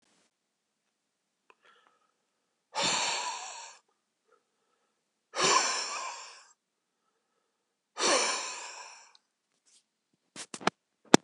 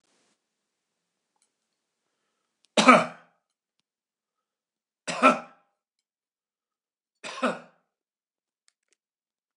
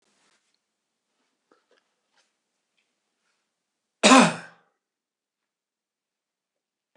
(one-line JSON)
{"exhalation_length": "11.2 s", "exhalation_amplitude": 26091, "exhalation_signal_mean_std_ratio": 0.3, "three_cough_length": "9.6 s", "three_cough_amplitude": 24817, "three_cough_signal_mean_std_ratio": 0.18, "cough_length": "7.0 s", "cough_amplitude": 25929, "cough_signal_mean_std_ratio": 0.16, "survey_phase": "beta (2021-08-13 to 2022-03-07)", "age": "45-64", "gender": "Male", "wearing_mask": "No", "symptom_none": true, "smoker_status": "Never smoked", "respiratory_condition_asthma": true, "respiratory_condition_other": false, "recruitment_source": "REACT", "submission_delay": "2 days", "covid_test_result": "Negative", "covid_test_method": "RT-qPCR", "influenza_a_test_result": "Negative", "influenza_b_test_result": "Negative"}